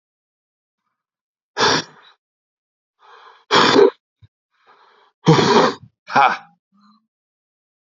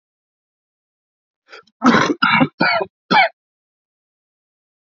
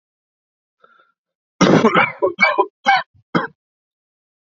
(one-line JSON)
{"exhalation_length": "7.9 s", "exhalation_amplitude": 32057, "exhalation_signal_mean_std_ratio": 0.33, "cough_length": "4.9 s", "cough_amplitude": 31246, "cough_signal_mean_std_ratio": 0.36, "three_cough_length": "4.5 s", "three_cough_amplitude": 29882, "three_cough_signal_mean_std_ratio": 0.39, "survey_phase": "alpha (2021-03-01 to 2021-08-12)", "age": "18-44", "gender": "Male", "wearing_mask": "No", "symptom_cough_any": true, "symptom_shortness_of_breath": true, "symptom_change_to_sense_of_smell_or_taste": true, "symptom_loss_of_taste": true, "symptom_onset": "4 days", "smoker_status": "Ex-smoker", "respiratory_condition_asthma": false, "respiratory_condition_other": false, "recruitment_source": "Test and Trace", "submission_delay": "2 days", "covid_test_result": "Positive", "covid_test_method": "RT-qPCR"}